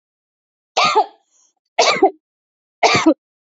{"three_cough_length": "3.5 s", "three_cough_amplitude": 28291, "three_cough_signal_mean_std_ratio": 0.4, "survey_phase": "beta (2021-08-13 to 2022-03-07)", "age": "18-44", "gender": "Female", "wearing_mask": "No", "symptom_cough_any": true, "symptom_new_continuous_cough": true, "symptom_sore_throat": true, "symptom_other": true, "symptom_onset": "3 days", "smoker_status": "Ex-smoker", "respiratory_condition_asthma": false, "respiratory_condition_other": false, "recruitment_source": "Test and Trace", "submission_delay": "1 day", "covid_test_result": "Negative", "covid_test_method": "RT-qPCR"}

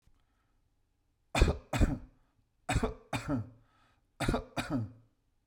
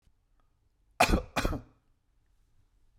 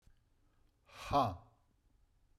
{"three_cough_length": "5.5 s", "three_cough_amplitude": 10026, "three_cough_signal_mean_std_ratio": 0.39, "cough_length": "3.0 s", "cough_amplitude": 11545, "cough_signal_mean_std_ratio": 0.29, "exhalation_length": "2.4 s", "exhalation_amplitude": 3063, "exhalation_signal_mean_std_ratio": 0.29, "survey_phase": "beta (2021-08-13 to 2022-03-07)", "age": "45-64", "gender": "Male", "wearing_mask": "No", "symptom_none": true, "smoker_status": "Never smoked", "respiratory_condition_asthma": false, "respiratory_condition_other": false, "recruitment_source": "Test and Trace", "submission_delay": "2 days", "covid_test_result": "Negative", "covid_test_method": "RT-qPCR"}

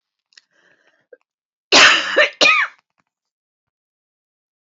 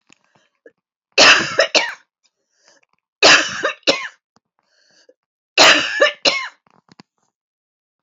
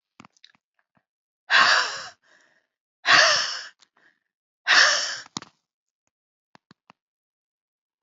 {"cough_length": "4.6 s", "cough_amplitude": 32753, "cough_signal_mean_std_ratio": 0.32, "three_cough_length": "8.0 s", "three_cough_amplitude": 32530, "three_cough_signal_mean_std_ratio": 0.35, "exhalation_length": "8.0 s", "exhalation_amplitude": 23606, "exhalation_signal_mean_std_ratio": 0.32, "survey_phase": "beta (2021-08-13 to 2022-03-07)", "age": "45-64", "gender": "Female", "wearing_mask": "No", "symptom_shortness_of_breath": true, "symptom_fatigue": true, "symptom_headache": true, "symptom_onset": "7 days", "smoker_status": "Never smoked", "respiratory_condition_asthma": true, "respiratory_condition_other": false, "recruitment_source": "REACT", "submission_delay": "1 day", "covid_test_result": "Negative", "covid_test_method": "RT-qPCR", "influenza_a_test_result": "Negative", "influenza_b_test_result": "Negative"}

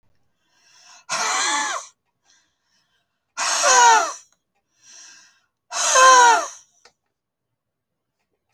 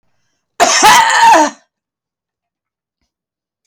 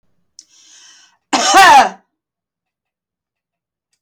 {"exhalation_length": "8.5 s", "exhalation_amplitude": 29920, "exhalation_signal_mean_std_ratio": 0.38, "cough_length": "3.7 s", "cough_amplitude": 32768, "cough_signal_mean_std_ratio": 0.44, "three_cough_length": "4.0 s", "three_cough_amplitude": 32768, "three_cough_signal_mean_std_ratio": 0.31, "survey_phase": "alpha (2021-03-01 to 2021-08-12)", "age": "65+", "gender": "Female", "wearing_mask": "No", "symptom_headache": true, "smoker_status": "Ex-smoker", "respiratory_condition_asthma": false, "respiratory_condition_other": false, "recruitment_source": "REACT", "submission_delay": "1 day", "covid_test_result": "Negative", "covid_test_method": "RT-qPCR"}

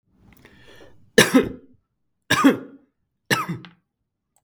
{"three_cough_length": "4.4 s", "three_cough_amplitude": 32768, "three_cough_signal_mean_std_ratio": 0.3, "survey_phase": "beta (2021-08-13 to 2022-03-07)", "age": "45-64", "gender": "Male", "wearing_mask": "No", "symptom_none": true, "smoker_status": "Never smoked", "respiratory_condition_asthma": false, "respiratory_condition_other": false, "recruitment_source": "REACT", "submission_delay": "1 day", "covid_test_result": "Negative", "covid_test_method": "RT-qPCR", "influenza_a_test_result": "Negative", "influenza_b_test_result": "Negative"}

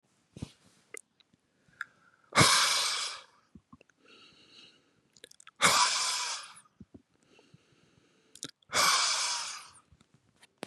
{"exhalation_length": "10.7 s", "exhalation_amplitude": 12240, "exhalation_signal_mean_std_ratio": 0.38, "survey_phase": "beta (2021-08-13 to 2022-03-07)", "age": "18-44", "gender": "Male", "wearing_mask": "No", "symptom_none": true, "smoker_status": "Never smoked", "respiratory_condition_asthma": false, "respiratory_condition_other": false, "recruitment_source": "REACT", "submission_delay": "2 days", "covid_test_result": "Negative", "covid_test_method": "RT-qPCR", "influenza_a_test_result": "Unknown/Void", "influenza_b_test_result": "Unknown/Void"}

